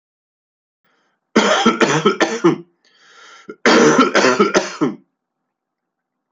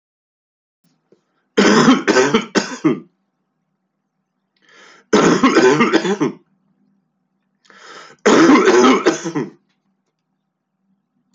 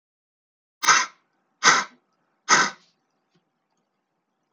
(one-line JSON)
{"cough_length": "6.3 s", "cough_amplitude": 32768, "cough_signal_mean_std_ratio": 0.47, "three_cough_length": "11.3 s", "three_cough_amplitude": 29628, "three_cough_signal_mean_std_ratio": 0.44, "exhalation_length": "4.5 s", "exhalation_amplitude": 27103, "exhalation_signal_mean_std_ratio": 0.28, "survey_phase": "beta (2021-08-13 to 2022-03-07)", "age": "45-64", "gender": "Male", "wearing_mask": "No", "symptom_none": true, "smoker_status": "Never smoked", "respiratory_condition_asthma": false, "respiratory_condition_other": false, "recruitment_source": "REACT", "submission_delay": "1 day", "covid_test_result": "Negative", "covid_test_method": "RT-qPCR"}